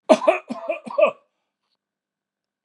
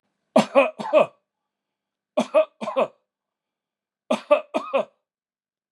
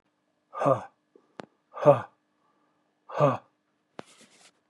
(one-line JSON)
{"cough_length": "2.6 s", "cough_amplitude": 31646, "cough_signal_mean_std_ratio": 0.32, "three_cough_length": "5.7 s", "three_cough_amplitude": 24347, "three_cough_signal_mean_std_ratio": 0.34, "exhalation_length": "4.7 s", "exhalation_amplitude": 19451, "exhalation_signal_mean_std_ratio": 0.26, "survey_phase": "beta (2021-08-13 to 2022-03-07)", "age": "65+", "gender": "Male", "wearing_mask": "No", "symptom_none": true, "symptom_onset": "13 days", "smoker_status": "Ex-smoker", "respiratory_condition_asthma": true, "respiratory_condition_other": true, "recruitment_source": "REACT", "submission_delay": "1 day", "covid_test_result": "Negative", "covid_test_method": "RT-qPCR", "influenza_a_test_result": "Negative", "influenza_b_test_result": "Negative"}